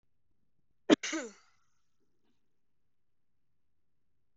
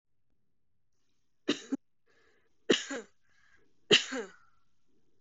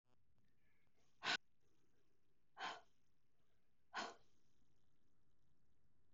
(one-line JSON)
{"cough_length": "4.4 s", "cough_amplitude": 12840, "cough_signal_mean_std_ratio": 0.16, "three_cough_length": "5.2 s", "three_cough_amplitude": 11692, "three_cough_signal_mean_std_ratio": 0.25, "exhalation_length": "6.1 s", "exhalation_amplitude": 1278, "exhalation_signal_mean_std_ratio": 0.49, "survey_phase": "beta (2021-08-13 to 2022-03-07)", "age": "18-44", "gender": "Female", "wearing_mask": "No", "symptom_none": true, "symptom_onset": "5 days", "smoker_status": "Never smoked", "respiratory_condition_asthma": false, "respiratory_condition_other": false, "recruitment_source": "REACT", "submission_delay": "1 day", "covid_test_result": "Negative", "covid_test_method": "RT-qPCR", "influenza_a_test_result": "Negative", "influenza_b_test_result": "Negative"}